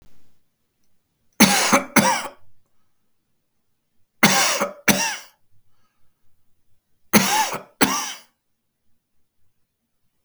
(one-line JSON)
{"three_cough_length": "10.2 s", "three_cough_amplitude": 32768, "three_cough_signal_mean_std_ratio": 0.35, "survey_phase": "beta (2021-08-13 to 2022-03-07)", "age": "65+", "gender": "Male", "wearing_mask": "No", "symptom_runny_or_blocked_nose": true, "smoker_status": "Never smoked", "respiratory_condition_asthma": false, "respiratory_condition_other": false, "recruitment_source": "REACT", "submission_delay": "3 days", "covid_test_result": "Negative", "covid_test_method": "RT-qPCR", "influenza_a_test_result": "Negative", "influenza_b_test_result": "Negative"}